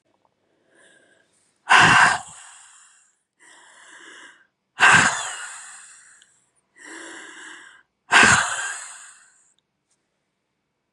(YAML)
exhalation_length: 10.9 s
exhalation_amplitude: 28892
exhalation_signal_mean_std_ratio: 0.31
survey_phase: beta (2021-08-13 to 2022-03-07)
age: 18-44
gender: Female
wearing_mask: 'No'
symptom_cough_any: true
symptom_shortness_of_breath: true
symptom_sore_throat: true
symptom_fatigue: true
symptom_change_to_sense_of_smell_or_taste: true
symptom_other: true
symptom_onset: 3 days
smoker_status: Never smoked
respiratory_condition_asthma: false
respiratory_condition_other: false
recruitment_source: Test and Trace
submission_delay: 1 day
covid_test_result: Positive
covid_test_method: RT-qPCR
covid_ct_value: 20.8
covid_ct_gene: ORF1ab gene
covid_ct_mean: 21.0
covid_viral_load: 130000 copies/ml
covid_viral_load_category: Low viral load (10K-1M copies/ml)